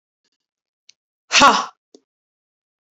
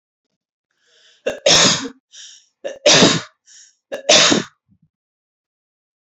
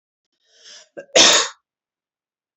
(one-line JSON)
{"exhalation_length": "2.9 s", "exhalation_amplitude": 29320, "exhalation_signal_mean_std_ratio": 0.24, "three_cough_length": "6.1 s", "three_cough_amplitude": 32768, "three_cough_signal_mean_std_ratio": 0.36, "cough_length": "2.6 s", "cough_amplitude": 32768, "cough_signal_mean_std_ratio": 0.29, "survey_phase": "beta (2021-08-13 to 2022-03-07)", "age": "18-44", "gender": "Female", "wearing_mask": "No", "symptom_none": true, "smoker_status": "Never smoked", "respiratory_condition_asthma": false, "respiratory_condition_other": false, "recruitment_source": "REACT", "submission_delay": "0 days", "covid_test_result": "Negative", "covid_test_method": "RT-qPCR", "influenza_a_test_result": "Negative", "influenza_b_test_result": "Negative"}